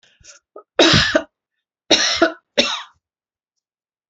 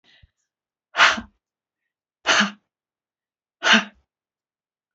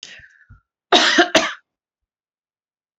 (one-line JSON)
{"three_cough_length": "4.1 s", "three_cough_amplitude": 31090, "three_cough_signal_mean_std_ratio": 0.38, "exhalation_length": "4.9 s", "exhalation_amplitude": 26979, "exhalation_signal_mean_std_ratio": 0.27, "cough_length": "3.0 s", "cough_amplitude": 31441, "cough_signal_mean_std_ratio": 0.32, "survey_phase": "beta (2021-08-13 to 2022-03-07)", "age": "65+", "gender": "Female", "wearing_mask": "No", "symptom_none": true, "symptom_onset": "12 days", "smoker_status": "Ex-smoker", "respiratory_condition_asthma": false, "respiratory_condition_other": false, "recruitment_source": "REACT", "submission_delay": "2 days", "covid_test_result": "Negative", "covid_test_method": "RT-qPCR"}